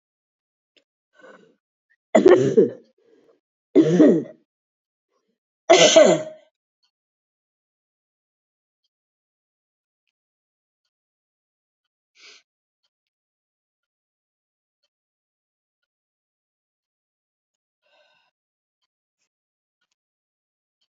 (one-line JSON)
{"three_cough_length": "21.0 s", "three_cough_amplitude": 27706, "three_cough_signal_mean_std_ratio": 0.2, "survey_phase": "beta (2021-08-13 to 2022-03-07)", "age": "65+", "gender": "Female", "wearing_mask": "No", "symptom_cough_any": true, "symptom_runny_or_blocked_nose": true, "symptom_sore_throat": true, "symptom_fatigue": true, "symptom_headache": true, "symptom_other": true, "smoker_status": "Never smoked", "respiratory_condition_asthma": false, "respiratory_condition_other": false, "recruitment_source": "Test and Trace", "submission_delay": "2 days", "covid_test_result": "Positive", "covid_test_method": "ePCR"}